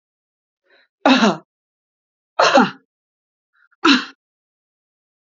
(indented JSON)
{
  "three_cough_length": "5.3 s",
  "three_cough_amplitude": 31920,
  "three_cough_signal_mean_std_ratio": 0.3,
  "survey_phase": "beta (2021-08-13 to 2022-03-07)",
  "age": "45-64",
  "gender": "Female",
  "wearing_mask": "No",
  "symptom_none": true,
  "smoker_status": "Never smoked",
  "respiratory_condition_asthma": false,
  "respiratory_condition_other": false,
  "recruitment_source": "REACT",
  "submission_delay": "3 days",
  "covid_test_result": "Negative",
  "covid_test_method": "RT-qPCR",
  "influenza_a_test_result": "Negative",
  "influenza_b_test_result": "Negative"
}